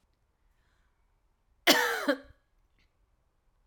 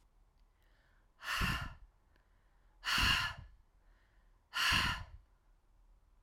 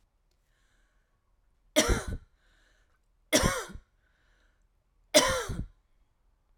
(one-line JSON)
{"cough_length": "3.7 s", "cough_amplitude": 15197, "cough_signal_mean_std_ratio": 0.26, "exhalation_length": "6.2 s", "exhalation_amplitude": 4184, "exhalation_signal_mean_std_ratio": 0.42, "three_cough_length": "6.6 s", "three_cough_amplitude": 14908, "three_cough_signal_mean_std_ratio": 0.3, "survey_phase": "alpha (2021-03-01 to 2021-08-12)", "age": "45-64", "gender": "Female", "wearing_mask": "No", "symptom_none": true, "smoker_status": "Prefer not to say", "respiratory_condition_asthma": true, "respiratory_condition_other": false, "recruitment_source": "REACT", "submission_delay": "1 day", "covid_test_result": "Negative", "covid_test_method": "RT-qPCR"}